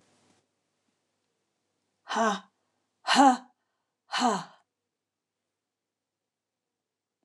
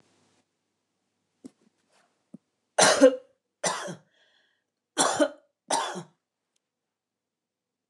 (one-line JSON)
{"exhalation_length": "7.2 s", "exhalation_amplitude": 14530, "exhalation_signal_mean_std_ratio": 0.25, "cough_length": "7.9 s", "cough_amplitude": 19560, "cough_signal_mean_std_ratio": 0.26, "survey_phase": "alpha (2021-03-01 to 2021-08-12)", "age": "65+", "gender": "Female", "wearing_mask": "No", "symptom_none": true, "smoker_status": "Ex-smoker", "respiratory_condition_asthma": false, "respiratory_condition_other": false, "recruitment_source": "REACT", "submission_delay": "2 days", "covid_test_result": "Negative", "covid_test_method": "RT-qPCR"}